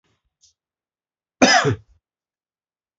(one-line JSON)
{"cough_length": "3.0 s", "cough_amplitude": 28148, "cough_signal_mean_std_ratio": 0.26, "survey_phase": "beta (2021-08-13 to 2022-03-07)", "age": "18-44", "gender": "Male", "wearing_mask": "No", "symptom_runny_or_blocked_nose": true, "symptom_sore_throat": true, "symptom_fatigue": true, "symptom_headache": true, "smoker_status": "Never smoked", "respiratory_condition_asthma": false, "respiratory_condition_other": false, "recruitment_source": "Test and Trace", "submission_delay": "1 day", "covid_test_result": "Positive", "covid_test_method": "RT-qPCR", "covid_ct_value": 15.0, "covid_ct_gene": "ORF1ab gene", "covid_ct_mean": 15.2, "covid_viral_load": "10000000 copies/ml", "covid_viral_load_category": "High viral load (>1M copies/ml)"}